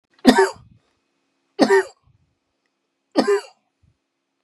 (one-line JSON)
{"three_cough_length": "4.4 s", "three_cough_amplitude": 32768, "three_cough_signal_mean_std_ratio": 0.31, "survey_phase": "beta (2021-08-13 to 2022-03-07)", "age": "45-64", "gender": "Male", "wearing_mask": "No", "symptom_none": true, "smoker_status": "Ex-smoker", "respiratory_condition_asthma": false, "respiratory_condition_other": false, "recruitment_source": "REACT", "submission_delay": "1 day", "covid_test_result": "Negative", "covid_test_method": "RT-qPCR", "influenza_a_test_result": "Negative", "influenza_b_test_result": "Negative"}